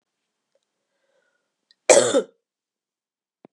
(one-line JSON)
{"cough_length": "3.5 s", "cough_amplitude": 31821, "cough_signal_mean_std_ratio": 0.22, "survey_phase": "beta (2021-08-13 to 2022-03-07)", "age": "18-44", "gender": "Female", "wearing_mask": "No", "symptom_cough_any": true, "symptom_runny_or_blocked_nose": true, "symptom_sore_throat": true, "symptom_fatigue": true, "symptom_fever_high_temperature": true, "symptom_headache": true, "symptom_change_to_sense_of_smell_or_taste": true, "symptom_onset": "2 days", "smoker_status": "Never smoked", "respiratory_condition_asthma": false, "respiratory_condition_other": false, "recruitment_source": "Test and Trace", "submission_delay": "2 days", "covid_test_result": "Positive", "covid_test_method": "RT-qPCR", "covid_ct_value": 14.8, "covid_ct_gene": "ORF1ab gene", "covid_ct_mean": 15.0, "covid_viral_load": "12000000 copies/ml", "covid_viral_load_category": "High viral load (>1M copies/ml)"}